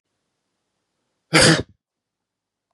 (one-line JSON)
{"cough_length": "2.7 s", "cough_amplitude": 32113, "cough_signal_mean_std_ratio": 0.25, "survey_phase": "beta (2021-08-13 to 2022-03-07)", "age": "45-64", "gender": "Male", "wearing_mask": "No", "symptom_none": true, "smoker_status": "Never smoked", "respiratory_condition_asthma": false, "respiratory_condition_other": false, "recruitment_source": "Test and Trace", "submission_delay": "1 day", "covid_test_result": "Negative", "covid_test_method": "ePCR"}